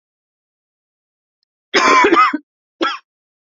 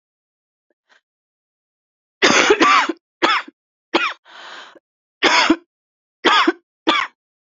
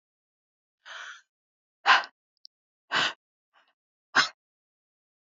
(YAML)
cough_length: 3.5 s
cough_amplitude: 29827
cough_signal_mean_std_ratio: 0.38
three_cough_length: 7.6 s
three_cough_amplitude: 32767
three_cough_signal_mean_std_ratio: 0.4
exhalation_length: 5.4 s
exhalation_amplitude: 15775
exhalation_signal_mean_std_ratio: 0.23
survey_phase: beta (2021-08-13 to 2022-03-07)
age: 45-64
gender: Female
wearing_mask: 'No'
symptom_cough_any: true
symptom_shortness_of_breath: true
symptom_sore_throat: true
symptom_fatigue: true
symptom_change_to_sense_of_smell_or_taste: true
symptom_loss_of_taste: true
symptom_onset: 9 days
smoker_status: Ex-smoker
respiratory_condition_asthma: false
respiratory_condition_other: false
recruitment_source: Test and Trace
submission_delay: 2 days
covid_test_result: Positive
covid_test_method: RT-qPCR
covid_ct_value: 22.4
covid_ct_gene: ORF1ab gene